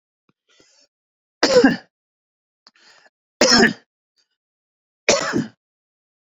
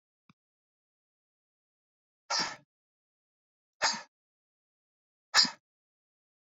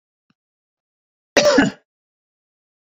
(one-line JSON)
{"three_cough_length": "6.4 s", "three_cough_amplitude": 32767, "three_cough_signal_mean_std_ratio": 0.3, "exhalation_length": "6.5 s", "exhalation_amplitude": 11719, "exhalation_signal_mean_std_ratio": 0.2, "cough_length": "3.0 s", "cough_amplitude": 31155, "cough_signal_mean_std_ratio": 0.27, "survey_phase": "beta (2021-08-13 to 2022-03-07)", "age": "65+", "gender": "Male", "wearing_mask": "No", "symptom_none": true, "smoker_status": "Never smoked", "respiratory_condition_asthma": false, "respiratory_condition_other": false, "recruitment_source": "REACT", "submission_delay": "3 days", "covid_test_result": "Negative", "covid_test_method": "RT-qPCR"}